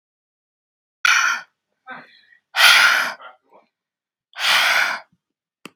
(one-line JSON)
{"exhalation_length": "5.8 s", "exhalation_amplitude": 32768, "exhalation_signal_mean_std_ratio": 0.41, "survey_phase": "beta (2021-08-13 to 2022-03-07)", "age": "18-44", "gender": "Female", "wearing_mask": "No", "symptom_none": true, "smoker_status": "Never smoked", "respiratory_condition_asthma": false, "respiratory_condition_other": false, "recruitment_source": "REACT", "submission_delay": "2 days", "covid_test_result": "Negative", "covid_test_method": "RT-qPCR"}